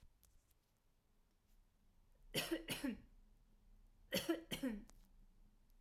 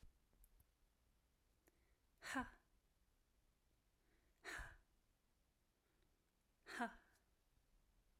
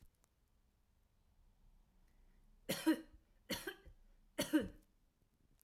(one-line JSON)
{"cough_length": "5.8 s", "cough_amplitude": 1469, "cough_signal_mean_std_ratio": 0.41, "exhalation_length": "8.2 s", "exhalation_amplitude": 685, "exhalation_signal_mean_std_ratio": 0.29, "three_cough_length": "5.6 s", "three_cough_amplitude": 2376, "three_cough_signal_mean_std_ratio": 0.28, "survey_phase": "alpha (2021-03-01 to 2021-08-12)", "age": "18-44", "gender": "Female", "wearing_mask": "No", "symptom_none": true, "smoker_status": "Never smoked", "respiratory_condition_asthma": false, "respiratory_condition_other": false, "recruitment_source": "REACT", "submission_delay": "2 days", "covid_test_result": "Negative", "covid_test_method": "RT-qPCR"}